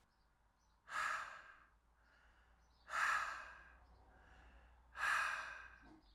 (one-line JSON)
{"exhalation_length": "6.1 s", "exhalation_amplitude": 1607, "exhalation_signal_mean_std_ratio": 0.46, "survey_phase": "alpha (2021-03-01 to 2021-08-12)", "age": "18-44", "gender": "Male", "wearing_mask": "No", "symptom_fatigue": true, "symptom_headache": true, "smoker_status": "Current smoker (e-cigarettes or vapes only)", "respiratory_condition_asthma": false, "respiratory_condition_other": false, "recruitment_source": "Test and Trace", "submission_delay": "1 day", "covid_test_result": "Positive", "covid_test_method": "RT-qPCR", "covid_ct_value": 20.1, "covid_ct_gene": "ORF1ab gene", "covid_ct_mean": 21.1, "covid_viral_load": "120000 copies/ml", "covid_viral_load_category": "Low viral load (10K-1M copies/ml)"}